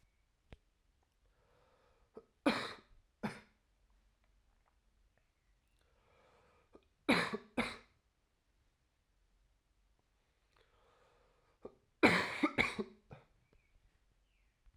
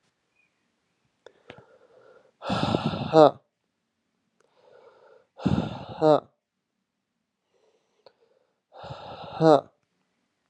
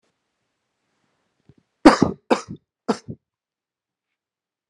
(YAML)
three_cough_length: 14.8 s
three_cough_amplitude: 9441
three_cough_signal_mean_std_ratio: 0.23
exhalation_length: 10.5 s
exhalation_amplitude: 27517
exhalation_signal_mean_std_ratio: 0.24
cough_length: 4.7 s
cough_amplitude: 32768
cough_signal_mean_std_ratio: 0.18
survey_phase: alpha (2021-03-01 to 2021-08-12)
age: 18-44
gender: Male
wearing_mask: 'No'
symptom_cough_any: true
symptom_new_continuous_cough: true
symptom_abdominal_pain: true
symptom_fatigue: true
symptom_fever_high_temperature: true
symptom_headache: true
symptom_change_to_sense_of_smell_or_taste: true
symptom_loss_of_taste: true
symptom_onset: 3 days
smoker_status: Never smoked
respiratory_condition_asthma: false
respiratory_condition_other: false
recruitment_source: Test and Trace
submission_delay: 1 day
covid_test_result: Positive
covid_test_method: RT-qPCR
covid_ct_value: 17.5
covid_ct_gene: ORF1ab gene
covid_ct_mean: 17.7
covid_viral_load: 1600000 copies/ml
covid_viral_load_category: High viral load (>1M copies/ml)